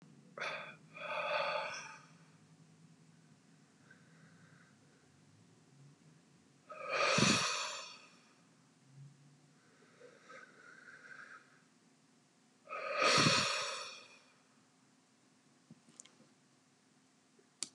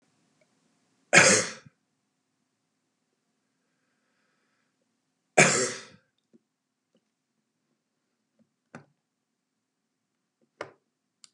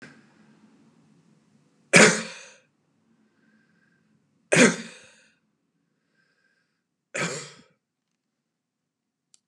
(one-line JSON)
{"exhalation_length": "17.7 s", "exhalation_amplitude": 5363, "exhalation_signal_mean_std_ratio": 0.37, "cough_length": "11.3 s", "cough_amplitude": 26717, "cough_signal_mean_std_ratio": 0.18, "three_cough_length": "9.5 s", "three_cough_amplitude": 32068, "three_cough_signal_mean_std_ratio": 0.2, "survey_phase": "beta (2021-08-13 to 2022-03-07)", "age": "65+", "gender": "Male", "wearing_mask": "No", "symptom_none": true, "smoker_status": "Ex-smoker", "respiratory_condition_asthma": false, "respiratory_condition_other": false, "recruitment_source": "REACT", "submission_delay": "1 day", "covid_test_result": "Negative", "covid_test_method": "RT-qPCR", "influenza_a_test_result": "Negative", "influenza_b_test_result": "Negative"}